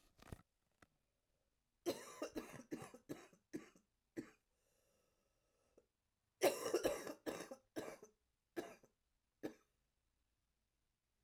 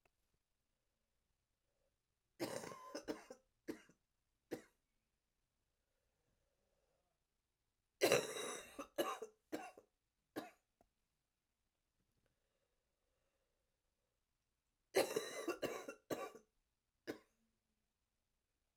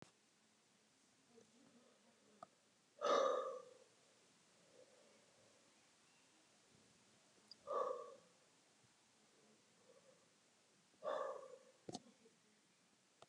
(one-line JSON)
{"cough_length": "11.2 s", "cough_amplitude": 2866, "cough_signal_mean_std_ratio": 0.3, "three_cough_length": "18.8 s", "three_cough_amplitude": 4008, "three_cough_signal_mean_std_ratio": 0.26, "exhalation_length": "13.3 s", "exhalation_amplitude": 2101, "exhalation_signal_mean_std_ratio": 0.3, "survey_phase": "alpha (2021-03-01 to 2021-08-12)", "age": "45-64", "gender": "Female", "wearing_mask": "No", "symptom_cough_any": true, "symptom_shortness_of_breath": true, "symptom_fatigue": true, "symptom_headache": true, "smoker_status": "Ex-smoker", "respiratory_condition_asthma": false, "respiratory_condition_other": false, "recruitment_source": "Test and Trace", "submission_delay": "2 days", "covid_test_result": "Positive", "covid_test_method": "RT-qPCR", "covid_ct_value": 17.5, "covid_ct_gene": "ORF1ab gene", "covid_ct_mean": 18.5, "covid_viral_load": "830000 copies/ml", "covid_viral_load_category": "Low viral load (10K-1M copies/ml)"}